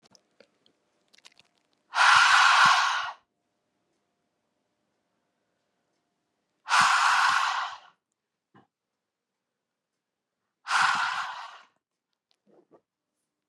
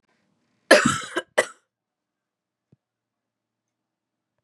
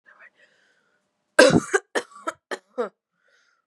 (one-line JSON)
{"exhalation_length": "13.5 s", "exhalation_amplitude": 15615, "exhalation_signal_mean_std_ratio": 0.36, "cough_length": "4.4 s", "cough_amplitude": 32255, "cough_signal_mean_std_ratio": 0.21, "three_cough_length": "3.7 s", "three_cough_amplitude": 32339, "three_cough_signal_mean_std_ratio": 0.26, "survey_phase": "beta (2021-08-13 to 2022-03-07)", "age": "18-44", "gender": "Female", "wearing_mask": "No", "symptom_cough_any": true, "symptom_runny_or_blocked_nose": true, "smoker_status": "Never smoked", "respiratory_condition_asthma": false, "respiratory_condition_other": false, "recruitment_source": "REACT", "submission_delay": "14 days", "covid_test_result": "Negative", "covid_test_method": "RT-qPCR"}